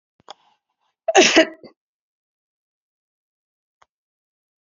{
  "cough_length": "4.6 s",
  "cough_amplitude": 30455,
  "cough_signal_mean_std_ratio": 0.21,
  "survey_phase": "beta (2021-08-13 to 2022-03-07)",
  "age": "65+",
  "gender": "Female",
  "wearing_mask": "No",
  "symptom_runny_or_blocked_nose": true,
  "symptom_shortness_of_breath": true,
  "symptom_onset": "6 days",
  "smoker_status": "Ex-smoker",
  "respiratory_condition_asthma": false,
  "respiratory_condition_other": false,
  "recruitment_source": "Test and Trace",
  "submission_delay": "2 days",
  "covid_test_result": "Positive",
  "covid_test_method": "ePCR"
}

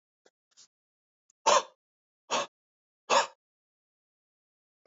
{
  "exhalation_length": "4.9 s",
  "exhalation_amplitude": 11711,
  "exhalation_signal_mean_std_ratio": 0.23,
  "survey_phase": "alpha (2021-03-01 to 2021-08-12)",
  "age": "45-64",
  "gender": "Male",
  "wearing_mask": "No",
  "symptom_none": true,
  "symptom_onset": "2 days",
  "smoker_status": "Never smoked",
  "respiratory_condition_asthma": false,
  "respiratory_condition_other": false,
  "recruitment_source": "REACT",
  "submission_delay": "1 day",
  "covid_test_result": "Negative",
  "covid_test_method": "RT-qPCR"
}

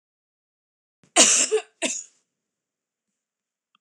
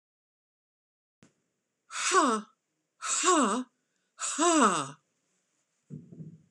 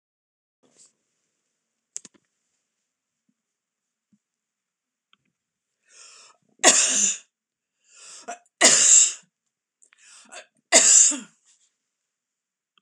{
  "cough_length": "3.8 s",
  "cough_amplitude": 26028,
  "cough_signal_mean_std_ratio": 0.28,
  "exhalation_length": "6.5 s",
  "exhalation_amplitude": 11852,
  "exhalation_signal_mean_std_ratio": 0.41,
  "three_cough_length": "12.8 s",
  "three_cough_amplitude": 26028,
  "three_cough_signal_mean_std_ratio": 0.27,
  "survey_phase": "beta (2021-08-13 to 2022-03-07)",
  "age": "65+",
  "gender": "Female",
  "wearing_mask": "No",
  "symptom_none": true,
  "smoker_status": "Never smoked",
  "respiratory_condition_asthma": false,
  "respiratory_condition_other": false,
  "recruitment_source": "REACT",
  "submission_delay": "2 days",
  "covid_test_result": "Negative",
  "covid_test_method": "RT-qPCR",
  "influenza_a_test_result": "Negative",
  "influenza_b_test_result": "Negative"
}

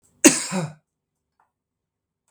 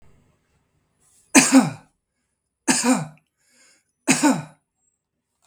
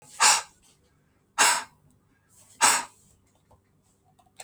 {
  "cough_length": "2.3 s",
  "cough_amplitude": 32768,
  "cough_signal_mean_std_ratio": 0.24,
  "three_cough_length": "5.5 s",
  "three_cough_amplitude": 32768,
  "three_cough_signal_mean_std_ratio": 0.32,
  "exhalation_length": "4.4 s",
  "exhalation_amplitude": 19669,
  "exhalation_signal_mean_std_ratio": 0.31,
  "survey_phase": "beta (2021-08-13 to 2022-03-07)",
  "age": "45-64",
  "gender": "Male",
  "wearing_mask": "No",
  "symptom_runny_or_blocked_nose": true,
  "symptom_onset": "13 days",
  "smoker_status": "Ex-smoker",
  "respiratory_condition_asthma": false,
  "respiratory_condition_other": false,
  "recruitment_source": "REACT",
  "submission_delay": "3 days",
  "covid_test_result": "Negative",
  "covid_test_method": "RT-qPCR",
  "influenza_a_test_result": "Negative",
  "influenza_b_test_result": "Negative"
}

